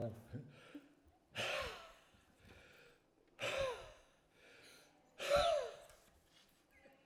{"exhalation_length": "7.1 s", "exhalation_amplitude": 2642, "exhalation_signal_mean_std_ratio": 0.42, "survey_phase": "alpha (2021-03-01 to 2021-08-12)", "age": "65+", "gender": "Male", "wearing_mask": "No", "symptom_none": true, "smoker_status": "Never smoked", "respiratory_condition_asthma": false, "respiratory_condition_other": false, "recruitment_source": "REACT", "submission_delay": "2 days", "covid_test_result": "Negative", "covid_test_method": "RT-qPCR"}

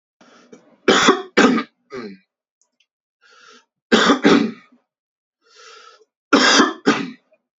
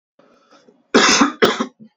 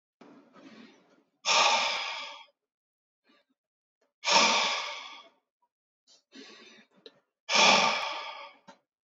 {"three_cough_length": "7.6 s", "three_cough_amplitude": 31705, "three_cough_signal_mean_std_ratio": 0.39, "cough_length": "2.0 s", "cough_amplitude": 31202, "cough_signal_mean_std_ratio": 0.44, "exhalation_length": "9.1 s", "exhalation_amplitude": 13908, "exhalation_signal_mean_std_ratio": 0.39, "survey_phase": "beta (2021-08-13 to 2022-03-07)", "age": "18-44", "gender": "Male", "wearing_mask": "No", "symptom_none": true, "smoker_status": "Never smoked", "respiratory_condition_asthma": false, "respiratory_condition_other": false, "recruitment_source": "REACT", "submission_delay": "1 day", "covid_test_result": "Negative", "covid_test_method": "RT-qPCR", "influenza_a_test_result": "Negative", "influenza_b_test_result": "Negative"}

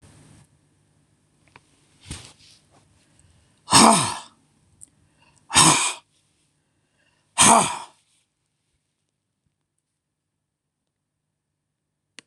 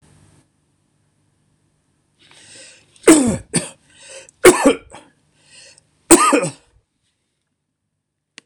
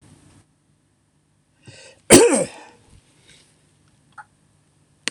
{"exhalation_length": "12.3 s", "exhalation_amplitude": 26028, "exhalation_signal_mean_std_ratio": 0.24, "three_cough_length": "8.5 s", "three_cough_amplitude": 26028, "three_cough_signal_mean_std_ratio": 0.27, "cough_length": "5.1 s", "cough_amplitude": 26028, "cough_signal_mean_std_ratio": 0.22, "survey_phase": "beta (2021-08-13 to 2022-03-07)", "age": "65+", "gender": "Male", "wearing_mask": "No", "symptom_runny_or_blocked_nose": true, "symptom_shortness_of_breath": true, "symptom_sore_throat": true, "smoker_status": "Ex-smoker", "respiratory_condition_asthma": false, "respiratory_condition_other": false, "recruitment_source": "REACT", "submission_delay": "1 day", "covid_test_result": "Negative", "covid_test_method": "RT-qPCR", "influenza_a_test_result": "Negative", "influenza_b_test_result": "Negative"}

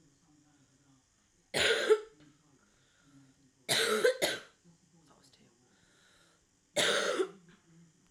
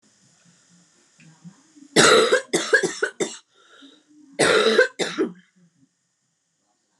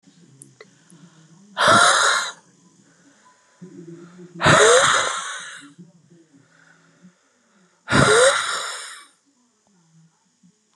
{"three_cough_length": "8.1 s", "three_cough_amplitude": 5816, "three_cough_signal_mean_std_ratio": 0.37, "cough_length": "7.0 s", "cough_amplitude": 32207, "cough_signal_mean_std_ratio": 0.39, "exhalation_length": "10.8 s", "exhalation_amplitude": 28344, "exhalation_signal_mean_std_ratio": 0.39, "survey_phase": "alpha (2021-03-01 to 2021-08-12)", "age": "18-44", "gender": "Female", "wearing_mask": "No", "symptom_new_continuous_cough": true, "symptom_shortness_of_breath": true, "symptom_fatigue": true, "symptom_fever_high_temperature": true, "symptom_headache": true, "symptom_change_to_sense_of_smell_or_taste": true, "symptom_loss_of_taste": true, "symptom_onset": "3 days", "smoker_status": "Current smoker (1 to 10 cigarettes per day)", "respiratory_condition_asthma": true, "respiratory_condition_other": false, "recruitment_source": "Test and Trace", "submission_delay": "2 days", "covid_test_result": "Positive", "covid_test_method": "RT-qPCR", "covid_ct_value": 15.5, "covid_ct_gene": "ORF1ab gene", "covid_ct_mean": 15.9, "covid_viral_load": "6000000 copies/ml", "covid_viral_load_category": "High viral load (>1M copies/ml)"}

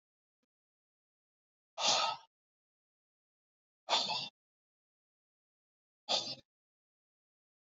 {"exhalation_length": "7.8 s", "exhalation_amplitude": 4474, "exhalation_signal_mean_std_ratio": 0.27, "survey_phase": "beta (2021-08-13 to 2022-03-07)", "age": "65+", "gender": "Male", "wearing_mask": "No", "symptom_cough_any": true, "symptom_runny_or_blocked_nose": true, "smoker_status": "Never smoked", "respiratory_condition_asthma": false, "respiratory_condition_other": false, "recruitment_source": "REACT", "submission_delay": "1 day", "covid_test_result": "Negative", "covid_test_method": "RT-qPCR", "influenza_a_test_result": "Negative", "influenza_b_test_result": "Negative"}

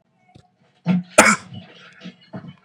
{"cough_length": "2.6 s", "cough_amplitude": 32768, "cough_signal_mean_std_ratio": 0.31, "survey_phase": "beta (2021-08-13 to 2022-03-07)", "age": "18-44", "gender": "Male", "wearing_mask": "No", "symptom_none": true, "smoker_status": "Never smoked", "respiratory_condition_asthma": true, "respiratory_condition_other": false, "recruitment_source": "REACT", "submission_delay": "4 days", "covid_test_result": "Negative", "covid_test_method": "RT-qPCR", "influenza_a_test_result": "Negative", "influenza_b_test_result": "Negative"}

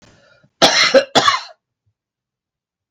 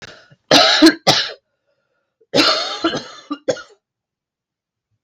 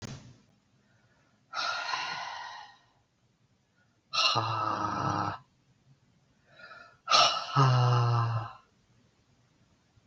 {"cough_length": "2.9 s", "cough_amplitude": 32768, "cough_signal_mean_std_ratio": 0.37, "three_cough_length": "5.0 s", "three_cough_amplitude": 32768, "three_cough_signal_mean_std_ratio": 0.39, "exhalation_length": "10.1 s", "exhalation_amplitude": 11848, "exhalation_signal_mean_std_ratio": 0.47, "survey_phase": "beta (2021-08-13 to 2022-03-07)", "age": "45-64", "gender": "Female", "wearing_mask": "No", "symptom_cough_any": true, "symptom_fatigue": true, "symptom_headache": true, "smoker_status": "Ex-smoker", "respiratory_condition_asthma": false, "respiratory_condition_other": false, "recruitment_source": "Test and Trace", "submission_delay": "2 days", "covid_test_result": "Positive", "covid_test_method": "LFT"}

